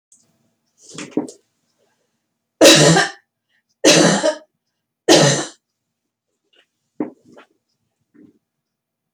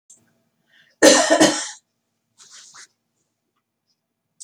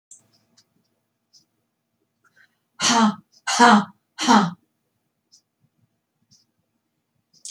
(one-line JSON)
{"three_cough_length": "9.1 s", "three_cough_amplitude": 32768, "three_cough_signal_mean_std_ratio": 0.31, "cough_length": "4.4 s", "cough_amplitude": 29016, "cough_signal_mean_std_ratio": 0.28, "exhalation_length": "7.5 s", "exhalation_amplitude": 27359, "exhalation_signal_mean_std_ratio": 0.28, "survey_phase": "beta (2021-08-13 to 2022-03-07)", "age": "45-64", "gender": "Female", "wearing_mask": "No", "symptom_prefer_not_to_say": true, "smoker_status": "Never smoked", "respiratory_condition_asthma": false, "respiratory_condition_other": false, "recruitment_source": "REACT", "submission_delay": "1 day", "covid_test_result": "Negative", "covid_test_method": "RT-qPCR", "influenza_a_test_result": "Negative", "influenza_b_test_result": "Negative"}